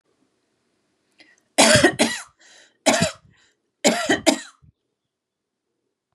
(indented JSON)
{
  "three_cough_length": "6.1 s",
  "three_cough_amplitude": 32767,
  "three_cough_signal_mean_std_ratio": 0.33,
  "survey_phase": "beta (2021-08-13 to 2022-03-07)",
  "age": "18-44",
  "gender": "Female",
  "wearing_mask": "No",
  "symptom_none": true,
  "smoker_status": "Never smoked",
  "respiratory_condition_asthma": false,
  "respiratory_condition_other": false,
  "recruitment_source": "REACT",
  "submission_delay": "0 days",
  "covid_test_result": "Negative",
  "covid_test_method": "RT-qPCR",
  "influenza_a_test_result": "Negative",
  "influenza_b_test_result": "Negative"
}